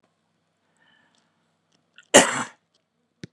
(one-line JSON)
{"cough_length": "3.3 s", "cough_amplitude": 32767, "cough_signal_mean_std_ratio": 0.18, "survey_phase": "beta (2021-08-13 to 2022-03-07)", "age": "18-44", "gender": "Female", "wearing_mask": "No", "symptom_sore_throat": true, "symptom_onset": "11 days", "smoker_status": "Current smoker (1 to 10 cigarettes per day)", "respiratory_condition_asthma": false, "respiratory_condition_other": false, "recruitment_source": "REACT", "submission_delay": "4 days", "covid_test_result": "Negative", "covid_test_method": "RT-qPCR", "influenza_a_test_result": "Negative", "influenza_b_test_result": "Negative"}